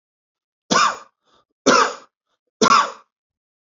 {"three_cough_length": "3.7 s", "three_cough_amplitude": 27454, "three_cough_signal_mean_std_ratio": 0.36, "survey_phase": "beta (2021-08-13 to 2022-03-07)", "age": "45-64", "gender": "Male", "wearing_mask": "No", "symptom_none": true, "smoker_status": "Never smoked", "respiratory_condition_asthma": false, "respiratory_condition_other": false, "recruitment_source": "REACT", "submission_delay": "1 day", "covid_test_result": "Negative", "covid_test_method": "RT-qPCR", "influenza_a_test_result": "Negative", "influenza_b_test_result": "Negative"}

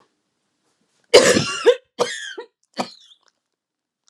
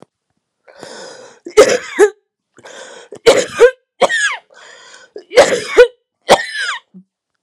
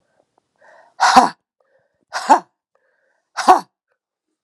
{"cough_length": "4.1 s", "cough_amplitude": 32768, "cough_signal_mean_std_ratio": 0.3, "three_cough_length": "7.4 s", "three_cough_amplitude": 32768, "three_cough_signal_mean_std_ratio": 0.38, "exhalation_length": "4.4 s", "exhalation_amplitude": 32768, "exhalation_signal_mean_std_ratio": 0.28, "survey_phase": "alpha (2021-03-01 to 2021-08-12)", "age": "18-44", "gender": "Female", "wearing_mask": "No", "symptom_cough_any": true, "symptom_new_continuous_cough": true, "symptom_fatigue": true, "symptom_fever_high_temperature": true, "symptom_headache": true, "symptom_change_to_sense_of_smell_or_taste": true, "symptom_loss_of_taste": true, "smoker_status": "Never smoked", "respiratory_condition_asthma": true, "respiratory_condition_other": false, "recruitment_source": "Test and Trace", "submission_delay": "2 days", "covid_test_result": "Positive", "covid_test_method": "LFT"}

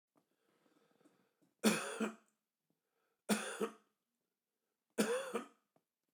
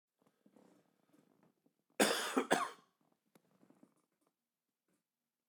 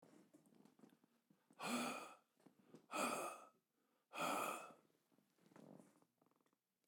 {"three_cough_length": "6.1 s", "three_cough_amplitude": 3928, "three_cough_signal_mean_std_ratio": 0.33, "cough_length": "5.5 s", "cough_amplitude": 7206, "cough_signal_mean_std_ratio": 0.25, "exhalation_length": "6.9 s", "exhalation_amplitude": 912, "exhalation_signal_mean_std_ratio": 0.41, "survey_phase": "beta (2021-08-13 to 2022-03-07)", "age": "45-64", "gender": "Male", "wearing_mask": "No", "symptom_cough_any": true, "symptom_runny_or_blocked_nose": true, "symptom_sore_throat": true, "symptom_fatigue": true, "symptom_headache": true, "symptom_change_to_sense_of_smell_or_taste": true, "symptom_onset": "5 days", "smoker_status": "Never smoked", "respiratory_condition_asthma": false, "respiratory_condition_other": false, "recruitment_source": "Test and Trace", "submission_delay": "2 days", "covid_test_result": "Positive", "covid_test_method": "RT-qPCR", "covid_ct_value": 16.9, "covid_ct_gene": "ORF1ab gene", "covid_ct_mean": 17.5, "covid_viral_load": "1900000 copies/ml", "covid_viral_load_category": "High viral load (>1M copies/ml)"}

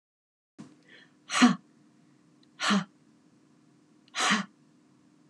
{"exhalation_length": "5.3 s", "exhalation_amplitude": 14264, "exhalation_signal_mean_std_ratio": 0.3, "survey_phase": "beta (2021-08-13 to 2022-03-07)", "age": "45-64", "gender": "Female", "wearing_mask": "No", "symptom_none": true, "smoker_status": "Never smoked", "respiratory_condition_asthma": false, "respiratory_condition_other": false, "recruitment_source": "REACT", "submission_delay": "1 day", "covid_test_result": "Negative", "covid_test_method": "RT-qPCR"}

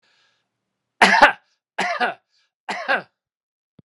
{"three_cough_length": "3.8 s", "three_cough_amplitude": 32767, "three_cough_signal_mean_std_ratio": 0.31, "survey_phase": "beta (2021-08-13 to 2022-03-07)", "age": "65+", "gender": "Male", "wearing_mask": "No", "symptom_none": true, "smoker_status": "Ex-smoker", "respiratory_condition_asthma": false, "respiratory_condition_other": false, "recruitment_source": "REACT", "submission_delay": "2 days", "covid_test_result": "Negative", "covid_test_method": "RT-qPCR", "influenza_a_test_result": "Negative", "influenza_b_test_result": "Negative"}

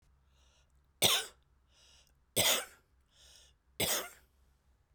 {"three_cough_length": "4.9 s", "three_cough_amplitude": 7324, "three_cough_signal_mean_std_ratio": 0.32, "survey_phase": "beta (2021-08-13 to 2022-03-07)", "age": "45-64", "gender": "Female", "wearing_mask": "No", "symptom_none": true, "smoker_status": "Ex-smoker", "respiratory_condition_asthma": false, "respiratory_condition_other": true, "recruitment_source": "REACT", "submission_delay": "1 day", "covid_test_result": "Negative", "covid_test_method": "RT-qPCR"}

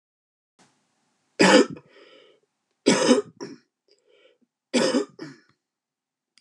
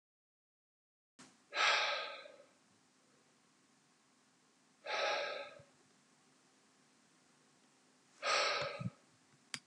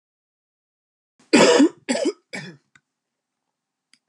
{"three_cough_length": "6.4 s", "three_cough_amplitude": 24239, "three_cough_signal_mean_std_ratio": 0.3, "exhalation_length": "9.7 s", "exhalation_amplitude": 3829, "exhalation_signal_mean_std_ratio": 0.37, "cough_length": "4.1 s", "cough_amplitude": 26719, "cough_signal_mean_std_ratio": 0.31, "survey_phase": "beta (2021-08-13 to 2022-03-07)", "age": "45-64", "gender": "Male", "wearing_mask": "No", "symptom_cough_any": true, "symptom_runny_or_blocked_nose": true, "symptom_fatigue": true, "symptom_fever_high_temperature": true, "symptom_headache": true, "symptom_change_to_sense_of_smell_or_taste": true, "symptom_other": true, "smoker_status": "Ex-smoker", "respiratory_condition_asthma": false, "respiratory_condition_other": false, "recruitment_source": "Test and Trace", "submission_delay": "1 day", "covid_test_result": "Positive", "covid_test_method": "RT-qPCR", "covid_ct_value": 22.0, "covid_ct_gene": "ORF1ab gene"}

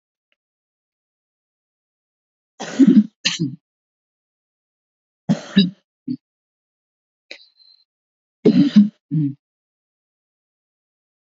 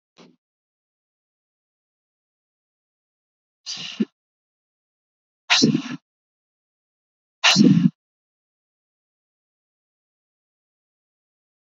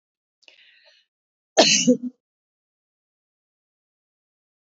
{"three_cough_length": "11.3 s", "three_cough_amplitude": 27283, "three_cough_signal_mean_std_ratio": 0.26, "exhalation_length": "11.7 s", "exhalation_amplitude": 25825, "exhalation_signal_mean_std_ratio": 0.21, "cough_length": "4.7 s", "cough_amplitude": 28478, "cough_signal_mean_std_ratio": 0.23, "survey_phase": "beta (2021-08-13 to 2022-03-07)", "age": "65+", "gender": "Female", "wearing_mask": "No", "symptom_none": true, "smoker_status": "Ex-smoker", "respiratory_condition_asthma": false, "respiratory_condition_other": false, "recruitment_source": "REACT", "submission_delay": "2 days", "covid_test_result": "Negative", "covid_test_method": "RT-qPCR", "influenza_a_test_result": "Unknown/Void", "influenza_b_test_result": "Unknown/Void"}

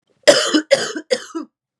{"cough_length": "1.8 s", "cough_amplitude": 32768, "cough_signal_mean_std_ratio": 0.45, "survey_phase": "beta (2021-08-13 to 2022-03-07)", "age": "18-44", "gender": "Female", "wearing_mask": "No", "symptom_cough_any": true, "symptom_runny_or_blocked_nose": true, "symptom_onset": "2 days", "smoker_status": "Never smoked", "respiratory_condition_asthma": false, "respiratory_condition_other": false, "recruitment_source": "Test and Trace", "submission_delay": "1 day", "covid_test_result": "Positive", "covid_test_method": "LAMP"}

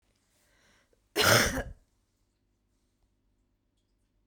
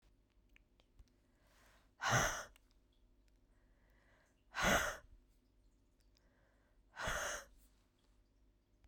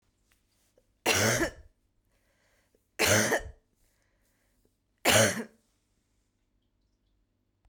{"cough_length": "4.3 s", "cough_amplitude": 17844, "cough_signal_mean_std_ratio": 0.26, "exhalation_length": "8.9 s", "exhalation_amplitude": 3006, "exhalation_signal_mean_std_ratio": 0.31, "three_cough_length": "7.7 s", "three_cough_amplitude": 13777, "three_cough_signal_mean_std_ratio": 0.32, "survey_phase": "beta (2021-08-13 to 2022-03-07)", "age": "18-44", "gender": "Female", "wearing_mask": "No", "symptom_new_continuous_cough": true, "symptom_runny_or_blocked_nose": true, "symptom_shortness_of_breath": true, "symptom_sore_throat": true, "symptom_fatigue": true, "symptom_fever_high_temperature": true, "symptom_change_to_sense_of_smell_or_taste": true, "symptom_loss_of_taste": true, "symptom_onset": "4 days", "smoker_status": "Never smoked", "respiratory_condition_asthma": true, "respiratory_condition_other": false, "recruitment_source": "Test and Trace", "submission_delay": "3 days", "covid_test_result": "Positive", "covid_test_method": "ePCR"}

